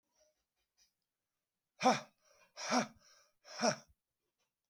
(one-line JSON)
{"exhalation_length": "4.7 s", "exhalation_amplitude": 4686, "exhalation_signal_mean_std_ratio": 0.27, "survey_phase": "beta (2021-08-13 to 2022-03-07)", "age": "65+", "gender": "Male", "wearing_mask": "No", "symptom_none": true, "smoker_status": "Ex-smoker", "respiratory_condition_asthma": false, "respiratory_condition_other": false, "recruitment_source": "REACT", "submission_delay": "4 days", "covid_test_result": "Negative", "covid_test_method": "RT-qPCR", "influenza_a_test_result": "Negative", "influenza_b_test_result": "Negative"}